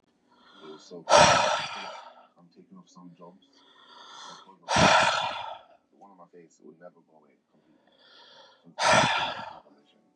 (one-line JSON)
{"exhalation_length": "10.2 s", "exhalation_amplitude": 20671, "exhalation_signal_mean_std_ratio": 0.36, "survey_phase": "beta (2021-08-13 to 2022-03-07)", "age": "18-44", "gender": "Male", "wearing_mask": "No", "symptom_cough_any": true, "symptom_new_continuous_cough": true, "symptom_runny_or_blocked_nose": true, "symptom_sore_throat": true, "symptom_abdominal_pain": true, "symptom_diarrhoea": true, "symptom_fatigue": true, "symptom_fever_high_temperature": true, "symptom_headache": true, "symptom_change_to_sense_of_smell_or_taste": true, "symptom_onset": "3 days", "smoker_status": "Never smoked", "respiratory_condition_asthma": false, "respiratory_condition_other": false, "recruitment_source": "Test and Trace", "submission_delay": "2 days", "covid_test_result": "Positive", "covid_test_method": "RT-qPCR", "covid_ct_value": 17.4, "covid_ct_gene": "N gene"}